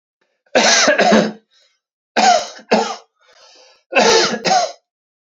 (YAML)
three_cough_length: 5.4 s
three_cough_amplitude: 32767
three_cough_signal_mean_std_ratio: 0.52
survey_phase: beta (2021-08-13 to 2022-03-07)
age: 18-44
gender: Male
wearing_mask: 'No'
symptom_none: true
smoker_status: Ex-smoker
respiratory_condition_asthma: true
respiratory_condition_other: false
recruitment_source: Test and Trace
submission_delay: 0 days
covid_test_result: Positive
covid_test_method: LFT